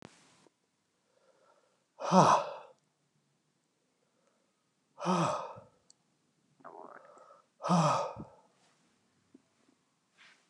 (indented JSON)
{
  "exhalation_length": "10.5 s",
  "exhalation_amplitude": 12522,
  "exhalation_signal_mean_std_ratio": 0.28,
  "survey_phase": "beta (2021-08-13 to 2022-03-07)",
  "age": "45-64",
  "gender": "Male",
  "wearing_mask": "No",
  "symptom_none": true,
  "symptom_onset": "7 days",
  "smoker_status": "Current smoker (1 to 10 cigarettes per day)",
  "respiratory_condition_asthma": false,
  "respiratory_condition_other": false,
  "recruitment_source": "REACT",
  "submission_delay": "1 day",
  "covid_test_result": "Negative",
  "covid_test_method": "RT-qPCR",
  "influenza_a_test_result": "Negative",
  "influenza_b_test_result": "Negative"
}